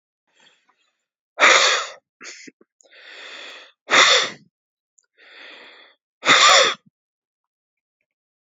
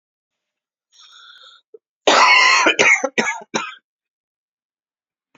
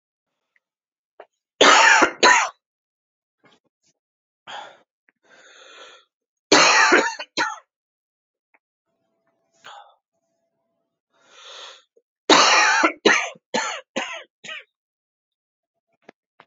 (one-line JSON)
{"exhalation_length": "8.5 s", "exhalation_amplitude": 32348, "exhalation_signal_mean_std_ratio": 0.33, "cough_length": "5.4 s", "cough_amplitude": 32350, "cough_signal_mean_std_ratio": 0.39, "three_cough_length": "16.5 s", "three_cough_amplitude": 32767, "three_cough_signal_mean_std_ratio": 0.32, "survey_phase": "beta (2021-08-13 to 2022-03-07)", "age": "18-44", "gender": "Male", "wearing_mask": "No", "symptom_cough_any": true, "symptom_runny_or_blocked_nose": true, "symptom_fatigue": true, "symptom_headache": true, "smoker_status": "Ex-smoker", "respiratory_condition_asthma": false, "respiratory_condition_other": false, "recruitment_source": "Test and Trace", "submission_delay": "2 days", "covid_test_result": "Positive", "covid_test_method": "RT-qPCR", "covid_ct_value": 23.0, "covid_ct_gene": "ORF1ab gene"}